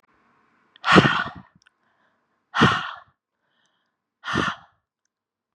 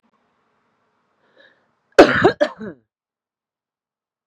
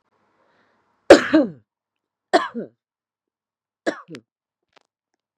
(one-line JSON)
{"exhalation_length": "5.5 s", "exhalation_amplitude": 32768, "exhalation_signal_mean_std_ratio": 0.29, "cough_length": "4.3 s", "cough_amplitude": 32768, "cough_signal_mean_std_ratio": 0.22, "three_cough_length": "5.4 s", "three_cough_amplitude": 32768, "three_cough_signal_mean_std_ratio": 0.2, "survey_phase": "beta (2021-08-13 to 2022-03-07)", "age": "18-44", "gender": "Female", "wearing_mask": "No", "symptom_runny_or_blocked_nose": true, "smoker_status": "Ex-smoker", "respiratory_condition_asthma": false, "respiratory_condition_other": false, "recruitment_source": "REACT", "submission_delay": "1 day", "covid_test_result": "Negative", "covid_test_method": "RT-qPCR", "influenza_a_test_result": "Negative", "influenza_b_test_result": "Negative"}